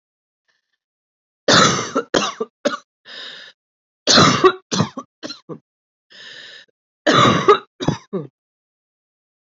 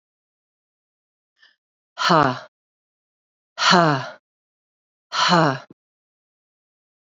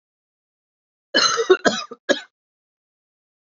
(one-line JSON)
{"three_cough_length": "9.6 s", "three_cough_amplitude": 32768, "three_cough_signal_mean_std_ratio": 0.37, "exhalation_length": "7.1 s", "exhalation_amplitude": 32768, "exhalation_signal_mean_std_ratio": 0.31, "cough_length": "3.5 s", "cough_amplitude": 27019, "cough_signal_mean_std_ratio": 0.31, "survey_phase": "beta (2021-08-13 to 2022-03-07)", "age": "45-64", "gender": "Female", "wearing_mask": "No", "symptom_cough_any": true, "symptom_runny_or_blocked_nose": true, "symptom_abdominal_pain": true, "symptom_headache": true, "smoker_status": "Never smoked", "respiratory_condition_asthma": false, "respiratory_condition_other": false, "recruitment_source": "Test and Trace", "submission_delay": "1 day", "covid_test_result": "Positive", "covid_test_method": "RT-qPCR", "covid_ct_value": 30.2, "covid_ct_gene": "ORF1ab gene", "covid_ct_mean": 30.9, "covid_viral_load": "75 copies/ml", "covid_viral_load_category": "Minimal viral load (< 10K copies/ml)"}